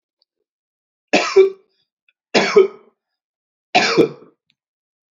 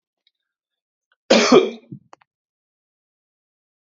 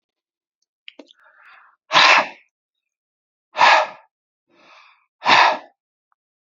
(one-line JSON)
{"three_cough_length": "5.1 s", "three_cough_amplitude": 31708, "three_cough_signal_mean_std_ratio": 0.33, "cough_length": "3.9 s", "cough_amplitude": 30932, "cough_signal_mean_std_ratio": 0.24, "exhalation_length": "6.6 s", "exhalation_amplitude": 32534, "exhalation_signal_mean_std_ratio": 0.31, "survey_phase": "beta (2021-08-13 to 2022-03-07)", "age": "45-64", "gender": "Male", "wearing_mask": "No", "symptom_none": true, "smoker_status": "Never smoked", "respiratory_condition_asthma": false, "respiratory_condition_other": false, "recruitment_source": "REACT", "submission_delay": "1 day", "covid_test_result": "Negative", "covid_test_method": "RT-qPCR", "influenza_a_test_result": "Unknown/Void", "influenza_b_test_result": "Unknown/Void"}